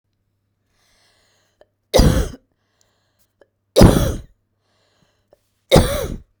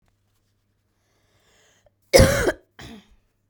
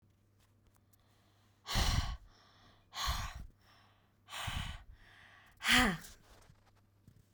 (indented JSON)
{
  "three_cough_length": "6.4 s",
  "three_cough_amplitude": 32768,
  "three_cough_signal_mean_std_ratio": 0.3,
  "cough_length": "3.5 s",
  "cough_amplitude": 32768,
  "cough_signal_mean_std_ratio": 0.25,
  "exhalation_length": "7.3 s",
  "exhalation_amplitude": 5742,
  "exhalation_signal_mean_std_ratio": 0.38,
  "survey_phase": "beta (2021-08-13 to 2022-03-07)",
  "age": "18-44",
  "gender": "Female",
  "wearing_mask": "No",
  "symptom_cough_any": true,
  "symptom_onset": "7 days",
  "smoker_status": "Never smoked",
  "respiratory_condition_asthma": false,
  "respiratory_condition_other": false,
  "recruitment_source": "REACT",
  "submission_delay": "2 days",
  "covid_test_result": "Negative",
  "covid_test_method": "RT-qPCR"
}